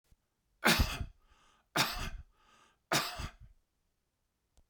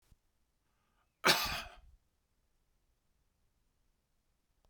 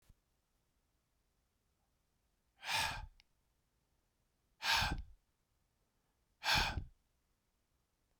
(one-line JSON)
{"three_cough_length": "4.7 s", "three_cough_amplitude": 8807, "three_cough_signal_mean_std_ratio": 0.35, "cough_length": "4.7 s", "cough_amplitude": 9333, "cough_signal_mean_std_ratio": 0.2, "exhalation_length": "8.2 s", "exhalation_amplitude": 3422, "exhalation_signal_mean_std_ratio": 0.3, "survey_phase": "beta (2021-08-13 to 2022-03-07)", "age": "65+", "gender": "Male", "wearing_mask": "No", "symptom_none": true, "smoker_status": "Ex-smoker", "respiratory_condition_asthma": false, "respiratory_condition_other": false, "recruitment_source": "REACT", "submission_delay": "1 day", "covid_test_result": "Negative", "covid_test_method": "RT-qPCR"}